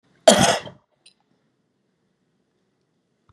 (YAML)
cough_length: 3.3 s
cough_amplitude: 32768
cough_signal_mean_std_ratio: 0.22
survey_phase: beta (2021-08-13 to 2022-03-07)
age: 65+
gender: Female
wearing_mask: 'No'
symptom_cough_any: true
symptom_abdominal_pain: true
symptom_onset: 9 days
smoker_status: Ex-smoker
respiratory_condition_asthma: false
respiratory_condition_other: false
recruitment_source: REACT
submission_delay: 1 day
covid_test_result: Negative
covid_test_method: RT-qPCR